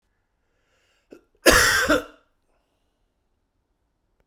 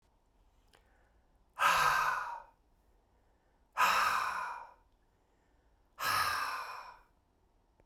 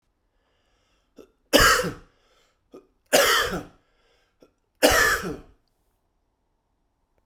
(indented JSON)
{
  "cough_length": "4.3 s",
  "cough_amplitude": 32767,
  "cough_signal_mean_std_ratio": 0.28,
  "exhalation_length": "7.9 s",
  "exhalation_amplitude": 6353,
  "exhalation_signal_mean_std_ratio": 0.45,
  "three_cough_length": "7.3 s",
  "three_cough_amplitude": 30186,
  "three_cough_signal_mean_std_ratio": 0.33,
  "survey_phase": "beta (2021-08-13 to 2022-03-07)",
  "age": "45-64",
  "gender": "Male",
  "wearing_mask": "No",
  "symptom_cough_any": true,
  "symptom_fatigue": true,
  "symptom_change_to_sense_of_smell_or_taste": true,
  "symptom_loss_of_taste": true,
  "symptom_onset": "2 days",
  "smoker_status": "Never smoked",
  "respiratory_condition_asthma": false,
  "respiratory_condition_other": false,
  "recruitment_source": "Test and Trace",
  "submission_delay": "2 days",
  "covid_test_result": "Positive",
  "covid_test_method": "RT-qPCR",
  "covid_ct_value": 17.4,
  "covid_ct_gene": "N gene",
  "covid_ct_mean": 18.1,
  "covid_viral_load": "1100000 copies/ml",
  "covid_viral_load_category": "High viral load (>1M copies/ml)"
}